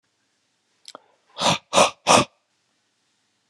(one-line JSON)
{"exhalation_length": "3.5 s", "exhalation_amplitude": 31498, "exhalation_signal_mean_std_ratio": 0.29, "survey_phase": "beta (2021-08-13 to 2022-03-07)", "age": "45-64", "gender": "Male", "wearing_mask": "No", "symptom_runny_or_blocked_nose": true, "symptom_other": true, "smoker_status": "Never smoked", "respiratory_condition_asthma": false, "respiratory_condition_other": false, "recruitment_source": "Test and Trace", "submission_delay": "2 days", "covid_test_result": "Positive", "covid_test_method": "LFT"}